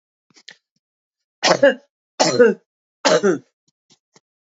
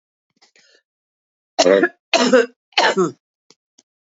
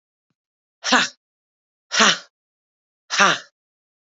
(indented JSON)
{
  "three_cough_length": "4.4 s",
  "three_cough_amplitude": 30044,
  "three_cough_signal_mean_std_ratio": 0.35,
  "cough_length": "4.1 s",
  "cough_amplitude": 29686,
  "cough_signal_mean_std_ratio": 0.37,
  "exhalation_length": "4.2 s",
  "exhalation_amplitude": 32615,
  "exhalation_signal_mean_std_ratio": 0.3,
  "survey_phase": "beta (2021-08-13 to 2022-03-07)",
  "age": "65+",
  "gender": "Female",
  "wearing_mask": "No",
  "symptom_none": true,
  "smoker_status": "Never smoked",
  "respiratory_condition_asthma": false,
  "respiratory_condition_other": false,
  "recruitment_source": "REACT",
  "submission_delay": "2 days",
  "covid_test_result": "Negative",
  "covid_test_method": "RT-qPCR",
  "influenza_a_test_result": "Negative",
  "influenza_b_test_result": "Negative"
}